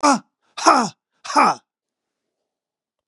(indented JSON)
{
  "exhalation_length": "3.1 s",
  "exhalation_amplitude": 29529,
  "exhalation_signal_mean_std_ratio": 0.36,
  "survey_phase": "beta (2021-08-13 to 2022-03-07)",
  "age": "45-64",
  "gender": "Male",
  "wearing_mask": "No",
  "symptom_none": true,
  "smoker_status": "Ex-smoker",
  "respiratory_condition_asthma": false,
  "respiratory_condition_other": true,
  "recruitment_source": "Test and Trace",
  "submission_delay": "1 day",
  "covid_test_result": "Negative",
  "covid_test_method": "RT-qPCR"
}